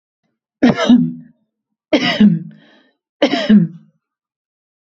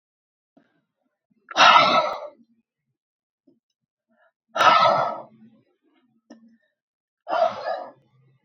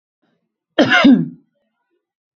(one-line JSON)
{"three_cough_length": "4.9 s", "three_cough_amplitude": 29171, "three_cough_signal_mean_std_ratio": 0.42, "exhalation_length": "8.4 s", "exhalation_amplitude": 27464, "exhalation_signal_mean_std_ratio": 0.33, "cough_length": "2.4 s", "cough_amplitude": 30172, "cough_signal_mean_std_ratio": 0.36, "survey_phase": "beta (2021-08-13 to 2022-03-07)", "age": "18-44", "gender": "Female", "wearing_mask": "No", "symptom_none": true, "smoker_status": "Never smoked", "respiratory_condition_asthma": false, "respiratory_condition_other": false, "recruitment_source": "Test and Trace", "submission_delay": "0 days", "covid_test_result": "Negative", "covid_test_method": "RT-qPCR"}